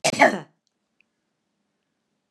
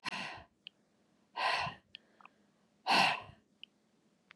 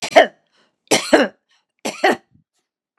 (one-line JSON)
{"cough_length": "2.3 s", "cough_amplitude": 28201, "cough_signal_mean_std_ratio": 0.24, "exhalation_length": "4.4 s", "exhalation_amplitude": 5503, "exhalation_signal_mean_std_ratio": 0.36, "three_cough_length": "3.0 s", "three_cough_amplitude": 32768, "three_cough_signal_mean_std_ratio": 0.33, "survey_phase": "beta (2021-08-13 to 2022-03-07)", "age": "65+", "gender": "Female", "wearing_mask": "No", "symptom_none": true, "smoker_status": "Ex-smoker", "respiratory_condition_asthma": false, "respiratory_condition_other": false, "recruitment_source": "Test and Trace", "submission_delay": "1 day", "covid_test_result": "Positive", "covid_test_method": "RT-qPCR", "covid_ct_value": 19.4, "covid_ct_gene": "ORF1ab gene"}